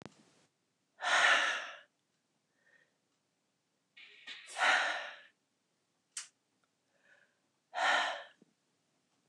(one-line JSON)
{"exhalation_length": "9.3 s", "exhalation_amplitude": 6133, "exhalation_signal_mean_std_ratio": 0.34, "survey_phase": "beta (2021-08-13 to 2022-03-07)", "age": "65+", "gender": "Female", "wearing_mask": "No", "symptom_none": true, "smoker_status": "Ex-smoker", "respiratory_condition_asthma": false, "respiratory_condition_other": false, "recruitment_source": "REACT", "submission_delay": "1 day", "covid_test_result": "Negative", "covid_test_method": "RT-qPCR", "influenza_a_test_result": "Negative", "influenza_b_test_result": "Negative"}